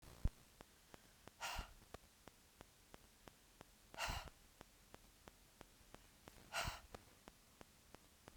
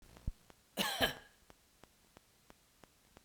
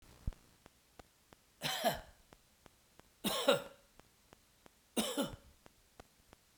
{"exhalation_length": "8.4 s", "exhalation_amplitude": 2033, "exhalation_signal_mean_std_ratio": 0.38, "cough_length": "3.2 s", "cough_amplitude": 4339, "cough_signal_mean_std_ratio": 0.31, "three_cough_length": "6.6 s", "three_cough_amplitude": 6554, "three_cough_signal_mean_std_ratio": 0.33, "survey_phase": "beta (2021-08-13 to 2022-03-07)", "age": "65+", "gender": "Male", "wearing_mask": "No", "symptom_none": true, "smoker_status": "Never smoked", "respiratory_condition_asthma": false, "respiratory_condition_other": false, "recruitment_source": "REACT", "submission_delay": "2 days", "covid_test_result": "Negative", "covid_test_method": "RT-qPCR"}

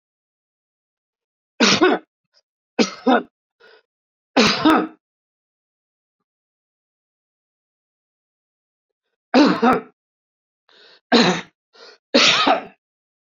{"three_cough_length": "13.2 s", "three_cough_amplitude": 27882, "three_cough_signal_mean_std_ratio": 0.33, "survey_phase": "beta (2021-08-13 to 2022-03-07)", "age": "65+", "gender": "Male", "wearing_mask": "No", "symptom_none": true, "smoker_status": "Ex-smoker", "respiratory_condition_asthma": false, "respiratory_condition_other": false, "recruitment_source": "REACT", "submission_delay": "3 days", "covid_test_result": "Negative", "covid_test_method": "RT-qPCR", "influenza_a_test_result": "Negative", "influenza_b_test_result": "Negative"}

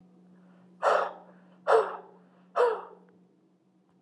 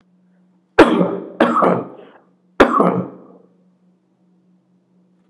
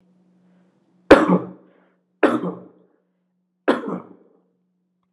{"exhalation_length": "4.0 s", "exhalation_amplitude": 11163, "exhalation_signal_mean_std_ratio": 0.37, "cough_length": "5.3 s", "cough_amplitude": 32768, "cough_signal_mean_std_ratio": 0.37, "three_cough_length": "5.1 s", "three_cough_amplitude": 32768, "three_cough_signal_mean_std_ratio": 0.27, "survey_phase": "alpha (2021-03-01 to 2021-08-12)", "age": "45-64", "gender": "Male", "wearing_mask": "Yes", "symptom_none": true, "smoker_status": "Never smoked", "respiratory_condition_asthma": false, "respiratory_condition_other": false, "recruitment_source": "Test and Trace", "submission_delay": "0 days", "covid_test_result": "Negative", "covid_test_method": "LFT"}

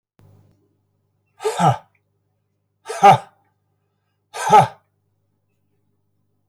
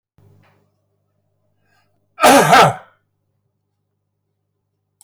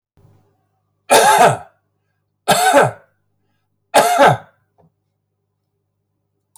{"exhalation_length": "6.5 s", "exhalation_amplitude": 27510, "exhalation_signal_mean_std_ratio": 0.25, "cough_length": "5.0 s", "cough_amplitude": 30997, "cough_signal_mean_std_ratio": 0.27, "three_cough_length": "6.6 s", "three_cough_amplitude": 30147, "three_cough_signal_mean_std_ratio": 0.37, "survey_phase": "beta (2021-08-13 to 2022-03-07)", "age": "65+", "gender": "Male", "wearing_mask": "No", "symptom_none": true, "smoker_status": "Ex-smoker", "respiratory_condition_asthma": true, "respiratory_condition_other": false, "recruitment_source": "REACT", "submission_delay": "3 days", "covid_test_result": "Negative", "covid_test_method": "RT-qPCR"}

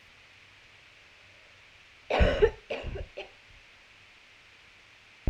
{"cough_length": "5.3 s", "cough_amplitude": 9702, "cough_signal_mean_std_ratio": 0.31, "survey_phase": "alpha (2021-03-01 to 2021-08-12)", "age": "18-44", "gender": "Female", "wearing_mask": "No", "symptom_cough_any": true, "symptom_shortness_of_breath": true, "symptom_fatigue": true, "symptom_fever_high_temperature": true, "symptom_headache": true, "symptom_onset": "4 days", "smoker_status": "Never smoked", "respiratory_condition_asthma": false, "respiratory_condition_other": false, "recruitment_source": "Test and Trace", "submission_delay": "2 days", "covid_test_result": "Positive", "covid_test_method": "RT-qPCR", "covid_ct_value": 17.4, "covid_ct_gene": "ORF1ab gene", "covid_ct_mean": 18.2, "covid_viral_load": "1100000 copies/ml", "covid_viral_load_category": "High viral load (>1M copies/ml)"}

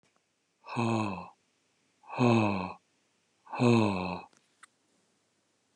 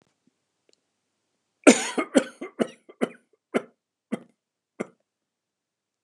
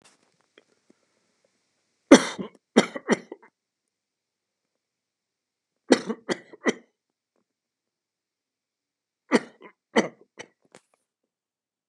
{"exhalation_length": "5.8 s", "exhalation_amplitude": 9041, "exhalation_signal_mean_std_ratio": 0.4, "cough_length": "6.0 s", "cough_amplitude": 30501, "cough_signal_mean_std_ratio": 0.2, "three_cough_length": "11.9 s", "three_cough_amplitude": 32767, "three_cough_signal_mean_std_ratio": 0.16, "survey_phase": "beta (2021-08-13 to 2022-03-07)", "age": "65+", "gender": "Male", "wearing_mask": "No", "symptom_none": true, "smoker_status": "Ex-smoker", "respiratory_condition_asthma": false, "respiratory_condition_other": false, "recruitment_source": "REACT", "submission_delay": "3 days", "covid_test_result": "Negative", "covid_test_method": "RT-qPCR", "influenza_a_test_result": "Negative", "influenza_b_test_result": "Negative"}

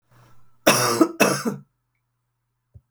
{"cough_length": "2.9 s", "cough_amplitude": 32766, "cough_signal_mean_std_ratio": 0.39, "survey_phase": "beta (2021-08-13 to 2022-03-07)", "age": "65+", "gender": "Female", "wearing_mask": "No", "symptom_none": true, "smoker_status": "Never smoked", "respiratory_condition_asthma": false, "respiratory_condition_other": false, "recruitment_source": "REACT", "submission_delay": "3 days", "covid_test_result": "Negative", "covid_test_method": "RT-qPCR", "influenza_a_test_result": "Negative", "influenza_b_test_result": "Negative"}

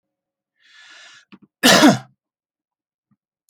{"cough_length": "3.5 s", "cough_amplitude": 32217, "cough_signal_mean_std_ratio": 0.26, "survey_phase": "alpha (2021-03-01 to 2021-08-12)", "age": "65+", "gender": "Male", "wearing_mask": "No", "symptom_none": true, "smoker_status": "Never smoked", "respiratory_condition_asthma": false, "respiratory_condition_other": false, "recruitment_source": "REACT", "submission_delay": "6 days", "covid_test_result": "Negative", "covid_test_method": "RT-qPCR"}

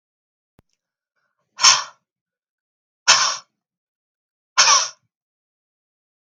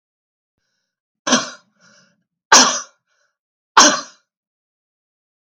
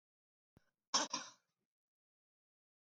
{"exhalation_length": "6.2 s", "exhalation_amplitude": 32768, "exhalation_signal_mean_std_ratio": 0.26, "three_cough_length": "5.5 s", "three_cough_amplitude": 32768, "three_cough_signal_mean_std_ratio": 0.26, "cough_length": "3.0 s", "cough_amplitude": 2343, "cough_signal_mean_std_ratio": 0.21, "survey_phase": "beta (2021-08-13 to 2022-03-07)", "age": "45-64", "gender": "Female", "wearing_mask": "No", "symptom_runny_or_blocked_nose": true, "symptom_onset": "12 days", "smoker_status": "Ex-smoker", "respiratory_condition_asthma": false, "respiratory_condition_other": false, "recruitment_source": "REACT", "submission_delay": "0 days", "covid_test_result": "Negative", "covid_test_method": "RT-qPCR", "influenza_a_test_result": "Negative", "influenza_b_test_result": "Negative"}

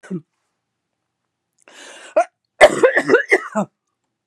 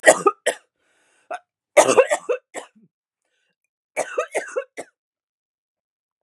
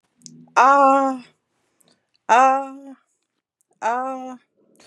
{"cough_length": "4.3 s", "cough_amplitude": 32768, "cough_signal_mean_std_ratio": 0.33, "three_cough_length": "6.2 s", "three_cough_amplitude": 32768, "three_cough_signal_mean_std_ratio": 0.28, "exhalation_length": "4.9 s", "exhalation_amplitude": 29462, "exhalation_signal_mean_std_ratio": 0.39, "survey_phase": "beta (2021-08-13 to 2022-03-07)", "age": "45-64", "gender": "Female", "wearing_mask": "No", "symptom_new_continuous_cough": true, "symptom_runny_or_blocked_nose": true, "symptom_sore_throat": true, "symptom_change_to_sense_of_smell_or_taste": true, "symptom_loss_of_taste": true, "symptom_onset": "8 days", "smoker_status": "Never smoked", "respiratory_condition_asthma": false, "respiratory_condition_other": false, "recruitment_source": "Test and Trace", "submission_delay": "1 day", "covid_test_result": "Positive", "covid_test_method": "RT-qPCR", "covid_ct_value": 19.5, "covid_ct_gene": "ORF1ab gene", "covid_ct_mean": 19.6, "covid_viral_load": "380000 copies/ml", "covid_viral_load_category": "Low viral load (10K-1M copies/ml)"}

